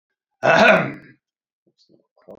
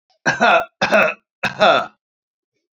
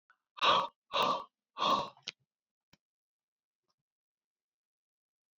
cough_length: 2.4 s
cough_amplitude: 28014
cough_signal_mean_std_ratio: 0.35
three_cough_length: 2.7 s
three_cough_amplitude: 28295
three_cough_signal_mean_std_ratio: 0.48
exhalation_length: 5.4 s
exhalation_amplitude: 6008
exhalation_signal_mean_std_ratio: 0.31
survey_phase: alpha (2021-03-01 to 2021-08-12)
age: 45-64
gender: Male
wearing_mask: 'No'
symptom_cough_any: true
symptom_shortness_of_breath: true
symptom_fatigue: true
symptom_headache: true
symptom_change_to_sense_of_smell_or_taste: true
symptom_loss_of_taste: true
smoker_status: Current smoker (1 to 10 cigarettes per day)
respiratory_condition_asthma: false
respiratory_condition_other: false
recruitment_source: Test and Trace
submission_delay: 2 days
covid_test_result: Positive
covid_test_method: RT-qPCR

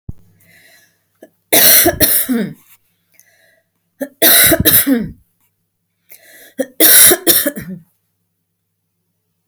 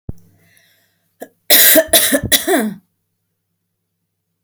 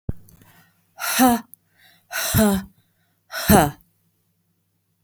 three_cough_length: 9.5 s
three_cough_amplitude: 32768
three_cough_signal_mean_std_ratio: 0.41
cough_length: 4.4 s
cough_amplitude: 32768
cough_signal_mean_std_ratio: 0.38
exhalation_length: 5.0 s
exhalation_amplitude: 29538
exhalation_signal_mean_std_ratio: 0.38
survey_phase: beta (2021-08-13 to 2022-03-07)
age: 45-64
gender: Female
wearing_mask: 'No'
symptom_none: true
smoker_status: Never smoked
respiratory_condition_asthma: false
respiratory_condition_other: false
recruitment_source: REACT
submission_delay: 3 days
covid_test_result: Negative
covid_test_method: RT-qPCR
influenza_a_test_result: Negative
influenza_b_test_result: Negative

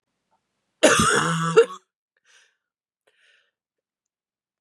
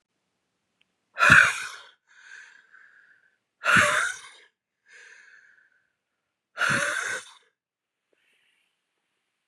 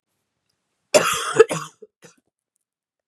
cough_length: 4.6 s
cough_amplitude: 28308
cough_signal_mean_std_ratio: 0.32
exhalation_length: 9.5 s
exhalation_amplitude: 28633
exhalation_signal_mean_std_ratio: 0.29
three_cough_length: 3.1 s
three_cough_amplitude: 32300
three_cough_signal_mean_std_ratio: 0.27
survey_phase: beta (2021-08-13 to 2022-03-07)
age: 18-44
gender: Female
wearing_mask: 'No'
symptom_cough_any: true
symptom_new_continuous_cough: true
symptom_runny_or_blocked_nose: true
symptom_sore_throat: true
symptom_other: true
smoker_status: Never smoked
respiratory_condition_asthma: false
respiratory_condition_other: false
recruitment_source: Test and Trace
submission_delay: 2 days
covid_test_result: Positive
covid_test_method: LFT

